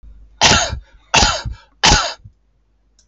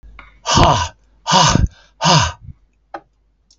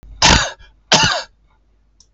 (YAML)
three_cough_length: 3.1 s
three_cough_amplitude: 32768
three_cough_signal_mean_std_ratio: 0.45
exhalation_length: 3.6 s
exhalation_amplitude: 32768
exhalation_signal_mean_std_ratio: 0.47
cough_length: 2.1 s
cough_amplitude: 32768
cough_signal_mean_std_ratio: 0.43
survey_phase: beta (2021-08-13 to 2022-03-07)
age: 65+
gender: Male
wearing_mask: 'No'
symptom_none: true
smoker_status: Never smoked
respiratory_condition_asthma: false
respiratory_condition_other: false
recruitment_source: REACT
submission_delay: 5 days
covid_test_result: Negative
covid_test_method: RT-qPCR
influenza_a_test_result: Negative
influenza_b_test_result: Negative